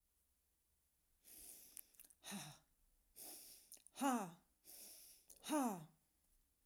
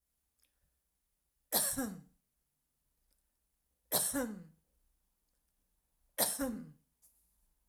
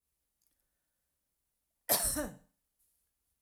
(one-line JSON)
{"exhalation_length": "6.7 s", "exhalation_amplitude": 1262, "exhalation_signal_mean_std_ratio": 0.36, "three_cough_length": "7.7 s", "three_cough_amplitude": 5931, "three_cough_signal_mean_std_ratio": 0.33, "cough_length": "3.4 s", "cough_amplitude": 6803, "cough_signal_mean_std_ratio": 0.26, "survey_phase": "alpha (2021-03-01 to 2021-08-12)", "age": "45-64", "gender": "Female", "wearing_mask": "No", "symptom_none": true, "smoker_status": "Never smoked", "respiratory_condition_asthma": false, "respiratory_condition_other": false, "recruitment_source": "REACT", "submission_delay": "2 days", "covid_test_result": "Negative", "covid_test_method": "RT-qPCR"}